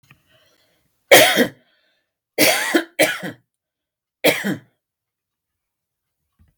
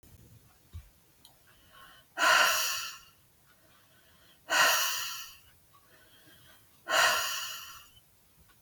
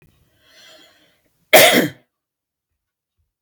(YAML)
three_cough_length: 6.6 s
three_cough_amplitude: 32768
three_cough_signal_mean_std_ratio: 0.32
exhalation_length: 8.6 s
exhalation_amplitude: 8766
exhalation_signal_mean_std_ratio: 0.41
cough_length: 3.4 s
cough_amplitude: 32768
cough_signal_mean_std_ratio: 0.26
survey_phase: beta (2021-08-13 to 2022-03-07)
age: 45-64
gender: Female
wearing_mask: 'No'
symptom_none: true
smoker_status: Never smoked
respiratory_condition_asthma: false
respiratory_condition_other: false
recruitment_source: REACT
submission_delay: 2 days
covid_test_result: Negative
covid_test_method: RT-qPCR
influenza_a_test_result: Negative
influenza_b_test_result: Negative